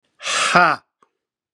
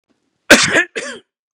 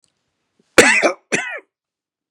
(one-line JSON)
{"exhalation_length": "1.5 s", "exhalation_amplitude": 32767, "exhalation_signal_mean_std_ratio": 0.42, "three_cough_length": "1.5 s", "three_cough_amplitude": 32768, "three_cough_signal_mean_std_ratio": 0.38, "cough_length": "2.3 s", "cough_amplitude": 32768, "cough_signal_mean_std_ratio": 0.34, "survey_phase": "beta (2021-08-13 to 2022-03-07)", "age": "45-64", "gender": "Male", "wearing_mask": "No", "symptom_change_to_sense_of_smell_or_taste": true, "symptom_loss_of_taste": true, "symptom_onset": "3 days", "smoker_status": "Ex-smoker", "respiratory_condition_asthma": false, "respiratory_condition_other": false, "recruitment_source": "Test and Trace", "submission_delay": "1 day", "covid_test_result": "Positive", "covid_test_method": "RT-qPCR", "covid_ct_value": 16.3, "covid_ct_gene": "ORF1ab gene", "covid_ct_mean": 16.9, "covid_viral_load": "2800000 copies/ml", "covid_viral_load_category": "High viral load (>1M copies/ml)"}